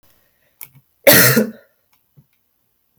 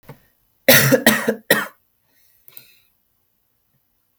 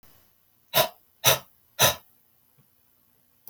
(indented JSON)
{
  "cough_length": "3.0 s",
  "cough_amplitude": 32768,
  "cough_signal_mean_std_ratio": 0.3,
  "three_cough_length": "4.2 s",
  "three_cough_amplitude": 32768,
  "three_cough_signal_mean_std_ratio": 0.31,
  "exhalation_length": "3.5 s",
  "exhalation_amplitude": 23415,
  "exhalation_signal_mean_std_ratio": 0.27,
  "survey_phase": "beta (2021-08-13 to 2022-03-07)",
  "age": "18-44",
  "gender": "Male",
  "wearing_mask": "No",
  "symptom_none": true,
  "smoker_status": "Never smoked",
  "respiratory_condition_asthma": false,
  "respiratory_condition_other": false,
  "recruitment_source": "REACT",
  "submission_delay": "2 days",
  "covid_test_result": "Negative",
  "covid_test_method": "RT-qPCR",
  "influenza_a_test_result": "Negative",
  "influenza_b_test_result": "Negative"
}